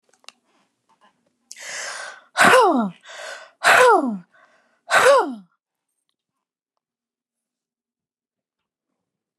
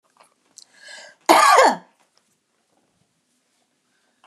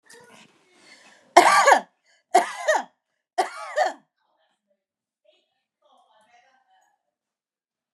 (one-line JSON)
{"exhalation_length": "9.4 s", "exhalation_amplitude": 31149, "exhalation_signal_mean_std_ratio": 0.34, "cough_length": "4.3 s", "cough_amplitude": 32738, "cough_signal_mean_std_ratio": 0.28, "three_cough_length": "7.9 s", "three_cough_amplitude": 32075, "three_cough_signal_mean_std_ratio": 0.27, "survey_phase": "beta (2021-08-13 to 2022-03-07)", "age": "45-64", "gender": "Female", "wearing_mask": "No", "symptom_none": true, "smoker_status": "Ex-smoker", "respiratory_condition_asthma": false, "respiratory_condition_other": false, "recruitment_source": "REACT", "submission_delay": "3 days", "covid_test_result": "Negative", "covid_test_method": "RT-qPCR"}